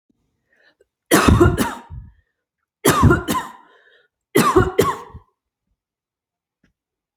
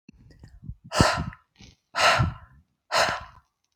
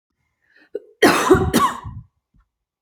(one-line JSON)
{"three_cough_length": "7.2 s", "three_cough_amplitude": 32438, "three_cough_signal_mean_std_ratio": 0.38, "exhalation_length": "3.8 s", "exhalation_amplitude": 20657, "exhalation_signal_mean_std_ratio": 0.42, "cough_length": "2.8 s", "cough_amplitude": 32621, "cough_signal_mean_std_ratio": 0.41, "survey_phase": "alpha (2021-03-01 to 2021-08-12)", "age": "18-44", "gender": "Female", "wearing_mask": "No", "symptom_none": true, "smoker_status": "Never smoked", "respiratory_condition_asthma": false, "respiratory_condition_other": false, "recruitment_source": "REACT", "submission_delay": "1 day", "covid_test_result": "Negative", "covid_test_method": "RT-qPCR"}